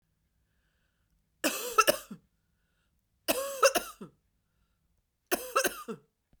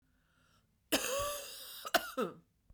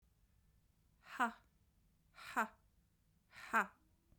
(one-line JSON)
{"three_cough_length": "6.4 s", "three_cough_amplitude": 12634, "three_cough_signal_mean_std_ratio": 0.3, "cough_length": "2.7 s", "cough_amplitude": 6185, "cough_signal_mean_std_ratio": 0.45, "exhalation_length": "4.2 s", "exhalation_amplitude": 2891, "exhalation_signal_mean_std_ratio": 0.26, "survey_phase": "beta (2021-08-13 to 2022-03-07)", "age": "45-64", "gender": "Female", "wearing_mask": "No", "symptom_cough_any": true, "symptom_runny_or_blocked_nose": true, "symptom_fatigue": true, "symptom_fever_high_temperature": true, "symptom_headache": true, "symptom_other": true, "symptom_onset": "3 days", "smoker_status": "Never smoked", "respiratory_condition_asthma": false, "respiratory_condition_other": false, "recruitment_source": "Test and Trace", "submission_delay": "2 days", "covid_test_result": "Positive", "covid_test_method": "RT-qPCR", "covid_ct_value": 16.1, "covid_ct_gene": "ORF1ab gene", "covid_ct_mean": 16.7, "covid_viral_load": "3400000 copies/ml", "covid_viral_load_category": "High viral load (>1M copies/ml)"}